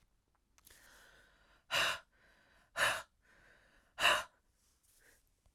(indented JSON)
{
  "exhalation_length": "5.5 s",
  "exhalation_amplitude": 5113,
  "exhalation_signal_mean_std_ratio": 0.3,
  "survey_phase": "beta (2021-08-13 to 2022-03-07)",
  "age": "18-44",
  "gender": "Female",
  "wearing_mask": "No",
  "symptom_runny_or_blocked_nose": true,
  "symptom_sore_throat": true,
  "symptom_fatigue": true,
  "symptom_change_to_sense_of_smell_or_taste": true,
  "symptom_loss_of_taste": true,
  "smoker_status": "Never smoked",
  "respiratory_condition_asthma": true,
  "respiratory_condition_other": false,
  "recruitment_source": "Test and Trace",
  "submission_delay": "2 days",
  "covid_test_result": "Positive",
  "covid_test_method": "RT-qPCR",
  "covid_ct_value": 22.6,
  "covid_ct_gene": "ORF1ab gene",
  "covid_ct_mean": 23.0,
  "covid_viral_load": "28000 copies/ml",
  "covid_viral_load_category": "Low viral load (10K-1M copies/ml)"
}